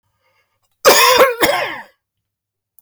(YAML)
cough_length: 2.8 s
cough_amplitude: 32768
cough_signal_mean_std_ratio: 0.44
survey_phase: beta (2021-08-13 to 2022-03-07)
age: 65+
gender: Male
wearing_mask: 'No'
symptom_none: true
smoker_status: Never smoked
respiratory_condition_asthma: false
respiratory_condition_other: false
recruitment_source: REACT
submission_delay: 1 day
covid_test_result: Negative
covid_test_method: RT-qPCR